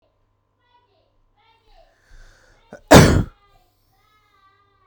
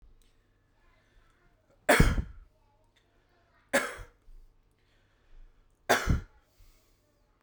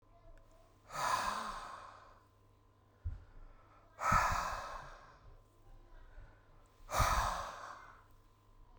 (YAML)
cough_length: 4.9 s
cough_amplitude: 32768
cough_signal_mean_std_ratio: 0.2
three_cough_length: 7.4 s
three_cough_amplitude: 12450
three_cough_signal_mean_std_ratio: 0.26
exhalation_length: 8.8 s
exhalation_amplitude: 3961
exhalation_signal_mean_std_ratio: 0.47
survey_phase: beta (2021-08-13 to 2022-03-07)
age: 18-44
gender: Male
wearing_mask: 'No'
symptom_runny_or_blocked_nose: true
symptom_sore_throat: true
symptom_onset: 2 days
smoker_status: Current smoker (1 to 10 cigarettes per day)
respiratory_condition_asthma: false
respiratory_condition_other: false
recruitment_source: Test and Trace
submission_delay: 1 day
covid_test_result: Negative
covid_test_method: RT-qPCR